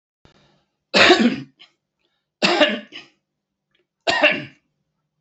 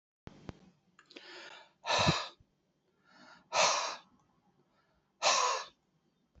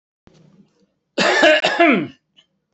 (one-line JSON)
{"three_cough_length": "5.2 s", "three_cough_amplitude": 28954, "three_cough_signal_mean_std_ratio": 0.36, "exhalation_length": "6.4 s", "exhalation_amplitude": 6714, "exhalation_signal_mean_std_ratio": 0.37, "cough_length": "2.7 s", "cough_amplitude": 32767, "cough_signal_mean_std_ratio": 0.47, "survey_phase": "beta (2021-08-13 to 2022-03-07)", "age": "45-64", "gender": "Male", "wearing_mask": "No", "symptom_cough_any": true, "symptom_runny_or_blocked_nose": true, "symptom_sore_throat": true, "symptom_headache": true, "symptom_change_to_sense_of_smell_or_taste": true, "symptom_onset": "6 days", "smoker_status": "Ex-smoker", "respiratory_condition_asthma": false, "respiratory_condition_other": false, "recruitment_source": "Test and Trace", "submission_delay": "3 days", "covid_test_result": "Positive", "covid_test_method": "RT-qPCR", "covid_ct_value": 17.2, "covid_ct_gene": "ORF1ab gene"}